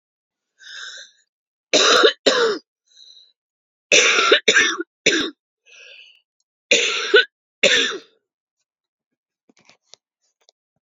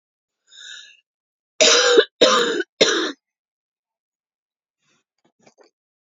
{
  "three_cough_length": "10.8 s",
  "three_cough_amplitude": 32767,
  "three_cough_signal_mean_std_ratio": 0.38,
  "cough_length": "6.1 s",
  "cough_amplitude": 31635,
  "cough_signal_mean_std_ratio": 0.34,
  "survey_phase": "beta (2021-08-13 to 2022-03-07)",
  "age": "45-64",
  "gender": "Female",
  "wearing_mask": "No",
  "symptom_cough_any": true,
  "symptom_runny_or_blocked_nose": true,
  "symptom_onset": "5 days",
  "smoker_status": "Never smoked",
  "respiratory_condition_asthma": false,
  "respiratory_condition_other": false,
  "recruitment_source": "Test and Trace",
  "submission_delay": "2 days",
  "covid_test_result": "Positive",
  "covid_test_method": "RT-qPCR",
  "covid_ct_value": 22.1,
  "covid_ct_gene": "N gene"
}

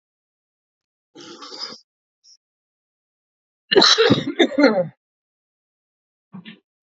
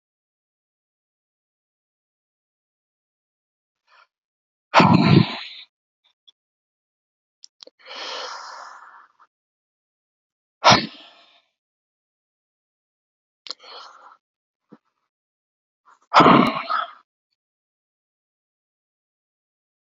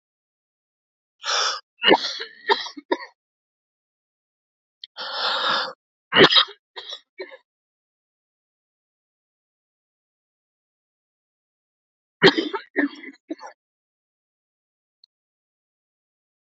{
  "cough_length": "6.8 s",
  "cough_amplitude": 29270,
  "cough_signal_mean_std_ratio": 0.3,
  "exhalation_length": "19.9 s",
  "exhalation_amplitude": 32434,
  "exhalation_signal_mean_std_ratio": 0.21,
  "three_cough_length": "16.5 s",
  "three_cough_amplitude": 30043,
  "three_cough_signal_mean_std_ratio": 0.25,
  "survey_phase": "alpha (2021-03-01 to 2021-08-12)",
  "age": "45-64",
  "gender": "Male",
  "wearing_mask": "No",
  "symptom_none": true,
  "smoker_status": "Current smoker (e-cigarettes or vapes only)",
  "respiratory_condition_asthma": true,
  "respiratory_condition_other": false,
  "recruitment_source": "REACT",
  "submission_delay": "1 day",
  "covid_test_result": "Negative",
  "covid_test_method": "RT-qPCR"
}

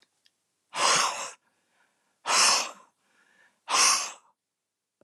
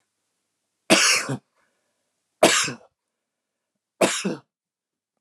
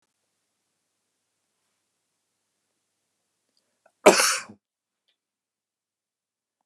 {
  "exhalation_length": "5.0 s",
  "exhalation_amplitude": 14197,
  "exhalation_signal_mean_std_ratio": 0.41,
  "three_cough_length": "5.2 s",
  "three_cough_amplitude": 27590,
  "three_cough_signal_mean_std_ratio": 0.32,
  "cough_length": "6.7 s",
  "cough_amplitude": 32597,
  "cough_signal_mean_std_ratio": 0.15,
  "survey_phase": "beta (2021-08-13 to 2022-03-07)",
  "age": "45-64",
  "gender": "Male",
  "wearing_mask": "No",
  "symptom_runny_or_blocked_nose": true,
  "smoker_status": "Never smoked",
  "respiratory_condition_asthma": false,
  "respiratory_condition_other": false,
  "recruitment_source": "REACT",
  "submission_delay": "1 day",
  "covid_test_result": "Negative",
  "covid_test_method": "RT-qPCR"
}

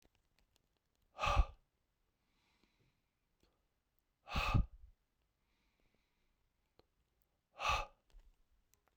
{
  "exhalation_length": "9.0 s",
  "exhalation_amplitude": 3670,
  "exhalation_signal_mean_std_ratio": 0.24,
  "survey_phase": "beta (2021-08-13 to 2022-03-07)",
  "age": "45-64",
  "gender": "Male",
  "wearing_mask": "No",
  "symptom_cough_any": true,
  "symptom_runny_or_blocked_nose": true,
  "symptom_sore_throat": true,
  "symptom_fatigue": true,
  "symptom_headache": true,
  "symptom_onset": "5 days",
  "smoker_status": "Ex-smoker",
  "respiratory_condition_asthma": false,
  "respiratory_condition_other": false,
  "recruitment_source": "Test and Trace",
  "submission_delay": "2 days",
  "covid_test_result": "Positive",
  "covid_test_method": "RT-qPCR",
  "covid_ct_value": 14.7,
  "covid_ct_gene": "N gene"
}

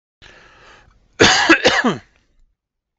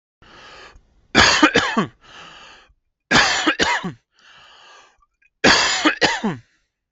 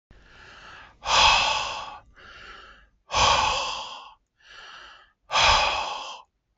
{
  "cough_length": "3.0 s",
  "cough_amplitude": 32768,
  "cough_signal_mean_std_ratio": 0.39,
  "three_cough_length": "6.9 s",
  "three_cough_amplitude": 32768,
  "three_cough_signal_mean_std_ratio": 0.45,
  "exhalation_length": "6.6 s",
  "exhalation_amplitude": 16914,
  "exhalation_signal_mean_std_ratio": 0.49,
  "survey_phase": "beta (2021-08-13 to 2022-03-07)",
  "age": "18-44",
  "gender": "Male",
  "wearing_mask": "No",
  "symptom_none": true,
  "smoker_status": "Never smoked",
  "respiratory_condition_asthma": true,
  "respiratory_condition_other": false,
  "recruitment_source": "REACT",
  "submission_delay": "1 day",
  "covid_test_result": "Negative",
  "covid_test_method": "RT-qPCR"
}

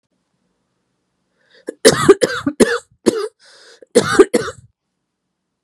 {
  "cough_length": "5.6 s",
  "cough_amplitude": 32768,
  "cough_signal_mean_std_ratio": 0.32,
  "survey_phase": "beta (2021-08-13 to 2022-03-07)",
  "age": "18-44",
  "gender": "Female",
  "wearing_mask": "No",
  "symptom_cough_any": true,
  "symptom_runny_or_blocked_nose": true,
  "symptom_abdominal_pain": true,
  "symptom_headache": true,
  "symptom_other": true,
  "smoker_status": "Never smoked",
  "respiratory_condition_asthma": true,
  "respiratory_condition_other": false,
  "recruitment_source": "Test and Trace",
  "submission_delay": "1 day",
  "covid_test_result": "Positive",
  "covid_test_method": "RT-qPCR",
  "covid_ct_value": 28.9,
  "covid_ct_gene": "ORF1ab gene",
  "covid_ct_mean": 29.8,
  "covid_viral_load": "170 copies/ml",
  "covid_viral_load_category": "Minimal viral load (< 10K copies/ml)"
}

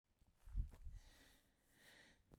{
  "cough_length": "2.4 s",
  "cough_amplitude": 790,
  "cough_signal_mean_std_ratio": 0.37,
  "survey_phase": "beta (2021-08-13 to 2022-03-07)",
  "age": "45-64",
  "gender": "Female",
  "wearing_mask": "No",
  "symptom_none": true,
  "smoker_status": "Never smoked",
  "respiratory_condition_asthma": false,
  "respiratory_condition_other": false,
  "recruitment_source": "REACT",
  "submission_delay": "2 days",
  "covid_test_result": "Negative",
  "covid_test_method": "RT-qPCR"
}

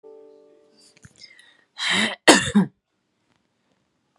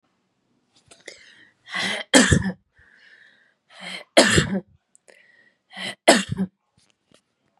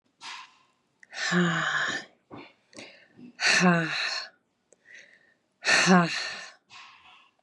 {
  "cough_length": "4.2 s",
  "cough_amplitude": 32768,
  "cough_signal_mean_std_ratio": 0.29,
  "three_cough_length": "7.6 s",
  "three_cough_amplitude": 32693,
  "three_cough_signal_mean_std_ratio": 0.31,
  "exhalation_length": "7.4 s",
  "exhalation_amplitude": 17565,
  "exhalation_signal_mean_std_ratio": 0.45,
  "survey_phase": "beta (2021-08-13 to 2022-03-07)",
  "age": "18-44",
  "gender": "Female",
  "wearing_mask": "No",
  "symptom_cough_any": true,
  "symptom_runny_or_blocked_nose": true,
  "symptom_sore_throat": true,
  "symptom_fatigue": true,
  "symptom_fever_high_temperature": true,
  "symptom_headache": true,
  "symptom_other": true,
  "symptom_onset": "4 days",
  "smoker_status": "Never smoked",
  "respiratory_condition_asthma": false,
  "respiratory_condition_other": false,
  "recruitment_source": "Test and Trace",
  "submission_delay": "2 days",
  "covid_test_result": "Positive",
  "covid_test_method": "RT-qPCR",
  "covid_ct_value": 26.1,
  "covid_ct_gene": "ORF1ab gene",
  "covid_ct_mean": 26.1,
  "covid_viral_load": "2700 copies/ml",
  "covid_viral_load_category": "Minimal viral load (< 10K copies/ml)"
}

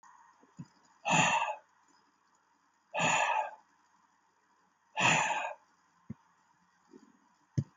{
  "exhalation_length": "7.8 s",
  "exhalation_amplitude": 6999,
  "exhalation_signal_mean_std_ratio": 0.39,
  "survey_phase": "alpha (2021-03-01 to 2021-08-12)",
  "age": "65+",
  "gender": "Male",
  "wearing_mask": "No",
  "symptom_shortness_of_breath": true,
  "symptom_fatigue": true,
  "smoker_status": "Current smoker (11 or more cigarettes per day)",
  "respiratory_condition_asthma": false,
  "respiratory_condition_other": false,
  "recruitment_source": "REACT",
  "submission_delay": "2 days",
  "covid_test_result": "Negative",
  "covid_test_method": "RT-qPCR"
}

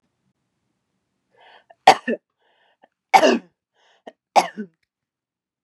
{
  "three_cough_length": "5.6 s",
  "three_cough_amplitude": 32768,
  "three_cough_signal_mean_std_ratio": 0.21,
  "survey_phase": "beta (2021-08-13 to 2022-03-07)",
  "age": "45-64",
  "gender": "Female",
  "wearing_mask": "No",
  "symptom_none": true,
  "smoker_status": "Never smoked",
  "respiratory_condition_asthma": false,
  "respiratory_condition_other": false,
  "recruitment_source": "REACT",
  "submission_delay": "1 day",
  "covid_test_result": "Negative",
  "covid_test_method": "RT-qPCR",
  "influenza_a_test_result": "Negative",
  "influenza_b_test_result": "Negative"
}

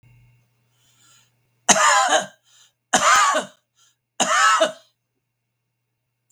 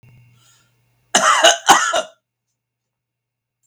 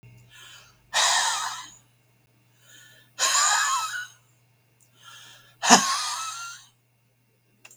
{
  "three_cough_length": "6.3 s",
  "three_cough_amplitude": 32766,
  "three_cough_signal_mean_std_ratio": 0.41,
  "cough_length": "3.7 s",
  "cough_amplitude": 32768,
  "cough_signal_mean_std_ratio": 0.35,
  "exhalation_length": "7.8 s",
  "exhalation_amplitude": 32766,
  "exhalation_signal_mean_std_ratio": 0.41,
  "survey_phase": "beta (2021-08-13 to 2022-03-07)",
  "age": "65+",
  "gender": "Male",
  "wearing_mask": "No",
  "symptom_runny_or_blocked_nose": true,
  "smoker_status": "Ex-smoker",
  "respiratory_condition_asthma": false,
  "respiratory_condition_other": false,
  "recruitment_source": "REACT",
  "submission_delay": "1 day",
  "covid_test_result": "Negative",
  "covid_test_method": "RT-qPCR"
}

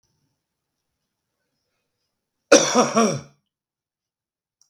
{
  "cough_length": "4.7 s",
  "cough_amplitude": 32768,
  "cough_signal_mean_std_ratio": 0.26,
  "survey_phase": "beta (2021-08-13 to 2022-03-07)",
  "age": "45-64",
  "gender": "Male",
  "wearing_mask": "No",
  "symptom_none": true,
  "smoker_status": "Ex-smoker",
  "respiratory_condition_asthma": false,
  "respiratory_condition_other": false,
  "recruitment_source": "REACT",
  "submission_delay": "2 days",
  "covid_test_result": "Negative",
  "covid_test_method": "RT-qPCR",
  "influenza_a_test_result": "Negative",
  "influenza_b_test_result": "Negative"
}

